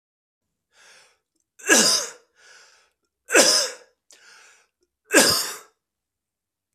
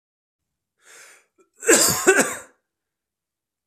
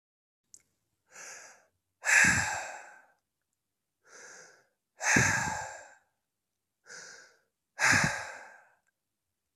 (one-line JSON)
{"three_cough_length": "6.7 s", "three_cough_amplitude": 32767, "three_cough_signal_mean_std_ratio": 0.32, "cough_length": "3.7 s", "cough_amplitude": 32261, "cough_signal_mean_std_ratio": 0.32, "exhalation_length": "9.6 s", "exhalation_amplitude": 10908, "exhalation_signal_mean_std_ratio": 0.34, "survey_phase": "beta (2021-08-13 to 2022-03-07)", "age": "18-44", "gender": "Male", "wearing_mask": "No", "symptom_runny_or_blocked_nose": true, "symptom_change_to_sense_of_smell_or_taste": true, "symptom_loss_of_taste": true, "smoker_status": "Never smoked", "respiratory_condition_asthma": false, "respiratory_condition_other": false, "recruitment_source": "Test and Trace", "submission_delay": "1 day", "covid_test_result": "Positive", "covid_test_method": "RT-qPCR", "covid_ct_value": 21.3, "covid_ct_gene": "ORF1ab gene", "covid_ct_mean": 21.7, "covid_viral_load": "75000 copies/ml", "covid_viral_load_category": "Low viral load (10K-1M copies/ml)"}